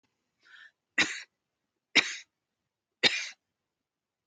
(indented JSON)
{
  "three_cough_length": "4.3 s",
  "three_cough_amplitude": 13002,
  "three_cough_signal_mean_std_ratio": 0.24,
  "survey_phase": "alpha (2021-03-01 to 2021-08-12)",
  "age": "65+",
  "gender": "Female",
  "wearing_mask": "No",
  "symptom_none": true,
  "smoker_status": "Prefer not to say",
  "respiratory_condition_asthma": false,
  "respiratory_condition_other": false,
  "recruitment_source": "REACT",
  "submission_delay": "3 days",
  "covid_test_result": "Negative",
  "covid_test_method": "RT-qPCR"
}